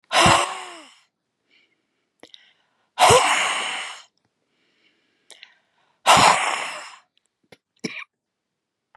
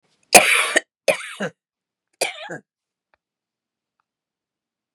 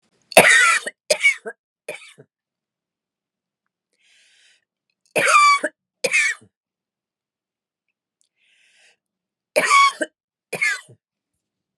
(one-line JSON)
{"exhalation_length": "9.0 s", "exhalation_amplitude": 30706, "exhalation_signal_mean_std_ratio": 0.35, "cough_length": "4.9 s", "cough_amplitude": 32768, "cough_signal_mean_std_ratio": 0.26, "three_cough_length": "11.8 s", "three_cough_amplitude": 32768, "three_cough_signal_mean_std_ratio": 0.32, "survey_phase": "beta (2021-08-13 to 2022-03-07)", "age": "65+", "gender": "Female", "wearing_mask": "No", "symptom_sore_throat": true, "smoker_status": "Never smoked", "respiratory_condition_asthma": false, "respiratory_condition_other": false, "recruitment_source": "REACT", "submission_delay": "1 day", "covid_test_result": "Negative", "covid_test_method": "RT-qPCR", "influenza_a_test_result": "Negative", "influenza_b_test_result": "Negative"}